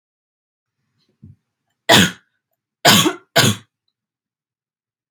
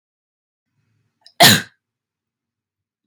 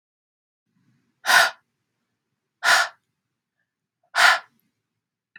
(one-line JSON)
{"three_cough_length": "5.1 s", "three_cough_amplitude": 31636, "three_cough_signal_mean_std_ratio": 0.29, "cough_length": "3.1 s", "cough_amplitude": 32768, "cough_signal_mean_std_ratio": 0.2, "exhalation_length": "5.4 s", "exhalation_amplitude": 24973, "exhalation_signal_mean_std_ratio": 0.28, "survey_phase": "beta (2021-08-13 to 2022-03-07)", "age": "18-44", "gender": "Female", "wearing_mask": "No", "symptom_none": true, "smoker_status": "Never smoked", "respiratory_condition_asthma": false, "respiratory_condition_other": false, "recruitment_source": "REACT", "submission_delay": "1 day", "covid_test_result": "Negative", "covid_test_method": "RT-qPCR"}